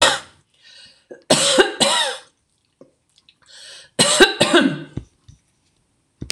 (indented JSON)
{
  "three_cough_length": "6.3 s",
  "three_cough_amplitude": 26028,
  "three_cough_signal_mean_std_ratio": 0.41,
  "survey_phase": "beta (2021-08-13 to 2022-03-07)",
  "age": "65+",
  "gender": "Female",
  "wearing_mask": "No",
  "symptom_none": true,
  "smoker_status": "Ex-smoker",
  "respiratory_condition_asthma": false,
  "respiratory_condition_other": false,
  "recruitment_source": "REACT",
  "submission_delay": "1 day",
  "covid_test_result": "Negative",
  "covid_test_method": "RT-qPCR",
  "influenza_a_test_result": "Negative",
  "influenza_b_test_result": "Negative"
}